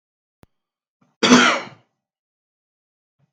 {"cough_length": "3.3 s", "cough_amplitude": 32768, "cough_signal_mean_std_ratio": 0.26, "survey_phase": "beta (2021-08-13 to 2022-03-07)", "age": "65+", "gender": "Male", "wearing_mask": "No", "symptom_cough_any": true, "symptom_onset": "8 days", "smoker_status": "Ex-smoker", "respiratory_condition_asthma": false, "respiratory_condition_other": false, "recruitment_source": "REACT", "submission_delay": "2 days", "covid_test_result": "Negative", "covid_test_method": "RT-qPCR", "influenza_a_test_result": "Negative", "influenza_b_test_result": "Negative"}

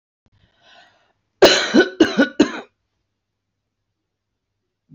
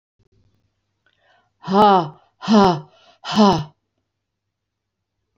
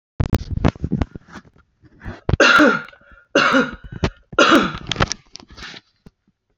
{"cough_length": "4.9 s", "cough_amplitude": 29390, "cough_signal_mean_std_ratio": 0.29, "exhalation_length": "5.4 s", "exhalation_amplitude": 27651, "exhalation_signal_mean_std_ratio": 0.35, "three_cough_length": "6.6 s", "three_cough_amplitude": 29549, "three_cough_signal_mean_std_ratio": 0.43, "survey_phase": "beta (2021-08-13 to 2022-03-07)", "age": "65+", "gender": "Female", "wearing_mask": "No", "symptom_none": true, "smoker_status": "Never smoked", "respiratory_condition_asthma": false, "respiratory_condition_other": false, "recruitment_source": "REACT", "submission_delay": "2 days", "covid_test_result": "Negative", "covid_test_method": "RT-qPCR", "influenza_a_test_result": "Negative", "influenza_b_test_result": "Negative"}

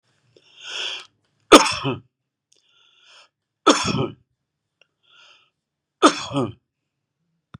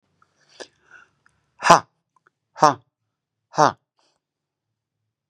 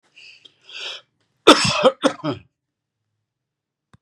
{"three_cough_length": "7.6 s", "three_cough_amplitude": 32768, "three_cough_signal_mean_std_ratio": 0.25, "exhalation_length": "5.3 s", "exhalation_amplitude": 32768, "exhalation_signal_mean_std_ratio": 0.17, "cough_length": "4.0 s", "cough_amplitude": 32768, "cough_signal_mean_std_ratio": 0.28, "survey_phase": "beta (2021-08-13 to 2022-03-07)", "age": "65+", "gender": "Male", "wearing_mask": "No", "symptom_none": true, "symptom_onset": "5 days", "smoker_status": "Never smoked", "respiratory_condition_asthma": false, "respiratory_condition_other": false, "recruitment_source": "REACT", "submission_delay": "3 days", "covid_test_result": "Negative", "covid_test_method": "RT-qPCR", "influenza_a_test_result": "Negative", "influenza_b_test_result": "Negative"}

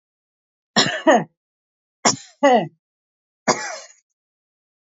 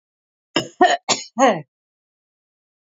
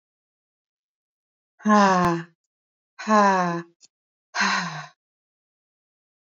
{"three_cough_length": "4.9 s", "three_cough_amplitude": 27311, "three_cough_signal_mean_std_ratio": 0.33, "cough_length": "2.8 s", "cough_amplitude": 26371, "cough_signal_mean_std_ratio": 0.34, "exhalation_length": "6.4 s", "exhalation_amplitude": 18780, "exhalation_signal_mean_std_ratio": 0.38, "survey_phase": "beta (2021-08-13 to 2022-03-07)", "age": "45-64", "gender": "Female", "wearing_mask": "No", "symptom_none": true, "smoker_status": "Never smoked", "respiratory_condition_asthma": false, "respiratory_condition_other": false, "recruitment_source": "REACT", "submission_delay": "2 days", "covid_test_result": "Negative", "covid_test_method": "RT-qPCR", "influenza_a_test_result": "Negative", "influenza_b_test_result": "Negative"}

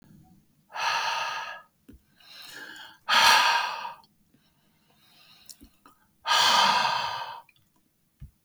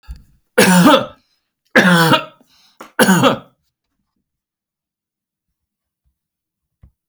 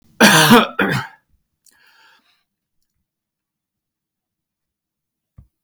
{"exhalation_length": "8.4 s", "exhalation_amplitude": 19109, "exhalation_signal_mean_std_ratio": 0.44, "three_cough_length": "7.1 s", "three_cough_amplitude": 32768, "three_cough_signal_mean_std_ratio": 0.36, "cough_length": "5.6 s", "cough_amplitude": 32768, "cough_signal_mean_std_ratio": 0.27, "survey_phase": "beta (2021-08-13 to 2022-03-07)", "age": "45-64", "gender": "Male", "wearing_mask": "No", "symptom_none": true, "smoker_status": "Never smoked", "respiratory_condition_asthma": false, "respiratory_condition_other": false, "recruitment_source": "Test and Trace", "submission_delay": "-1 day", "covid_test_result": "Negative", "covid_test_method": "LFT"}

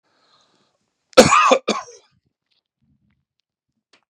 {"cough_length": "4.1 s", "cough_amplitude": 32768, "cough_signal_mean_std_ratio": 0.25, "survey_phase": "beta (2021-08-13 to 2022-03-07)", "age": "45-64", "gender": "Male", "wearing_mask": "No", "symptom_none": true, "smoker_status": "Ex-smoker", "respiratory_condition_asthma": false, "respiratory_condition_other": false, "recruitment_source": "REACT", "submission_delay": "32 days", "covid_test_result": "Negative", "covid_test_method": "RT-qPCR", "influenza_a_test_result": "Negative", "influenza_b_test_result": "Negative"}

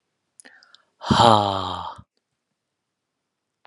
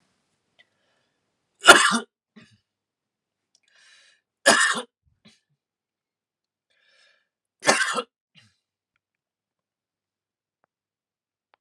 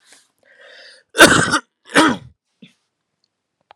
{"exhalation_length": "3.7 s", "exhalation_amplitude": 32131, "exhalation_signal_mean_std_ratio": 0.29, "three_cough_length": "11.6 s", "three_cough_amplitude": 32768, "three_cough_signal_mean_std_ratio": 0.19, "cough_length": "3.8 s", "cough_amplitude": 32768, "cough_signal_mean_std_ratio": 0.31, "survey_phase": "beta (2021-08-13 to 2022-03-07)", "age": "18-44", "gender": "Male", "wearing_mask": "No", "symptom_fatigue": true, "symptom_onset": "12 days", "smoker_status": "Never smoked", "respiratory_condition_asthma": false, "respiratory_condition_other": false, "recruitment_source": "REACT", "submission_delay": "3 days", "covid_test_result": "Negative", "covid_test_method": "RT-qPCR"}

